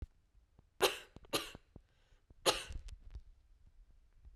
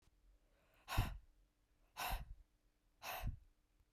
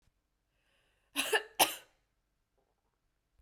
three_cough_length: 4.4 s
three_cough_amplitude: 7060
three_cough_signal_mean_std_ratio: 0.31
exhalation_length: 3.9 s
exhalation_amplitude: 1961
exhalation_signal_mean_std_ratio: 0.39
cough_length: 3.4 s
cough_amplitude: 8743
cough_signal_mean_std_ratio: 0.23
survey_phase: beta (2021-08-13 to 2022-03-07)
age: 18-44
gender: Female
wearing_mask: 'No'
symptom_cough_any: true
symptom_runny_or_blocked_nose: true
symptom_fatigue: true
symptom_headache: true
symptom_loss_of_taste: true
symptom_onset: 3 days
smoker_status: Never smoked
respiratory_condition_asthma: true
respiratory_condition_other: false
recruitment_source: Test and Trace
submission_delay: 2 days
covid_test_result: Positive
covid_test_method: RT-qPCR
covid_ct_value: 20.0
covid_ct_gene: ORF1ab gene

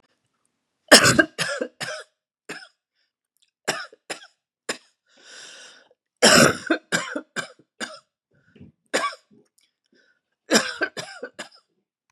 three_cough_length: 12.1 s
three_cough_amplitude: 32768
three_cough_signal_mean_std_ratio: 0.28
survey_phase: beta (2021-08-13 to 2022-03-07)
age: 45-64
gender: Female
wearing_mask: 'No'
symptom_cough_any: true
symptom_new_continuous_cough: true
symptom_runny_or_blocked_nose: true
symptom_fatigue: true
symptom_onset: 3 days
smoker_status: Never smoked
respiratory_condition_asthma: false
respiratory_condition_other: false
recruitment_source: Test and Trace
submission_delay: 1 day
covid_test_result: Negative
covid_test_method: RT-qPCR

